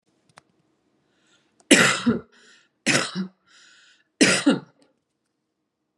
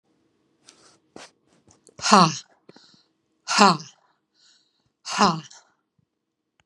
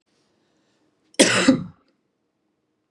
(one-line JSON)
{"three_cough_length": "6.0 s", "three_cough_amplitude": 32767, "three_cough_signal_mean_std_ratio": 0.32, "exhalation_length": "6.7 s", "exhalation_amplitude": 31764, "exhalation_signal_mean_std_ratio": 0.25, "cough_length": "2.9 s", "cough_amplitude": 31382, "cough_signal_mean_std_ratio": 0.28, "survey_phase": "beta (2021-08-13 to 2022-03-07)", "age": "45-64", "gender": "Female", "wearing_mask": "No", "symptom_none": true, "smoker_status": "Never smoked", "respiratory_condition_asthma": false, "respiratory_condition_other": false, "recruitment_source": "REACT", "submission_delay": "3 days", "covid_test_result": "Negative", "covid_test_method": "RT-qPCR", "influenza_a_test_result": "Negative", "influenza_b_test_result": "Negative"}